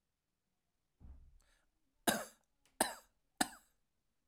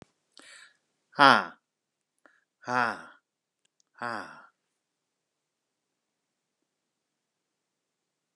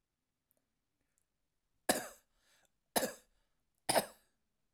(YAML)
cough_length: 4.3 s
cough_amplitude: 6228
cough_signal_mean_std_ratio: 0.21
exhalation_length: 8.4 s
exhalation_amplitude: 24725
exhalation_signal_mean_std_ratio: 0.16
three_cough_length: 4.7 s
three_cough_amplitude: 6839
three_cough_signal_mean_std_ratio: 0.22
survey_phase: alpha (2021-03-01 to 2021-08-12)
age: 45-64
gender: Male
wearing_mask: 'No'
symptom_none: true
smoker_status: Never smoked
respiratory_condition_asthma: false
respiratory_condition_other: false
recruitment_source: REACT
submission_delay: 1 day
covid_test_result: Negative
covid_test_method: RT-qPCR